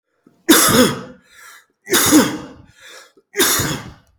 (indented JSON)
{
  "three_cough_length": "4.2 s",
  "three_cough_amplitude": 32768,
  "three_cough_signal_mean_std_ratio": 0.49,
  "survey_phase": "beta (2021-08-13 to 2022-03-07)",
  "age": "45-64",
  "gender": "Male",
  "wearing_mask": "No",
  "symptom_cough_any": true,
  "symptom_new_continuous_cough": true,
  "symptom_runny_or_blocked_nose": true,
  "symptom_other": true,
  "symptom_onset": "3 days",
  "smoker_status": "Never smoked",
  "respiratory_condition_asthma": true,
  "respiratory_condition_other": false,
  "recruitment_source": "REACT",
  "submission_delay": "1 day",
  "covid_test_result": "Negative",
  "covid_test_method": "RT-qPCR",
  "influenza_a_test_result": "Negative",
  "influenza_b_test_result": "Negative"
}